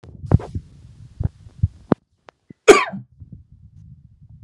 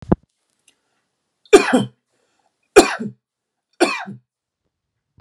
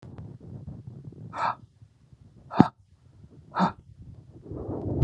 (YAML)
cough_length: 4.4 s
cough_amplitude: 32768
cough_signal_mean_std_ratio: 0.24
three_cough_length: 5.2 s
three_cough_amplitude: 32768
three_cough_signal_mean_std_ratio: 0.25
exhalation_length: 5.0 s
exhalation_amplitude: 30125
exhalation_signal_mean_std_ratio: 0.34
survey_phase: alpha (2021-03-01 to 2021-08-12)
age: 45-64
gender: Male
wearing_mask: 'No'
symptom_none: true
smoker_status: Ex-smoker
respiratory_condition_asthma: false
respiratory_condition_other: false
recruitment_source: REACT
submission_delay: 2 days
covid_test_result: Negative
covid_test_method: RT-qPCR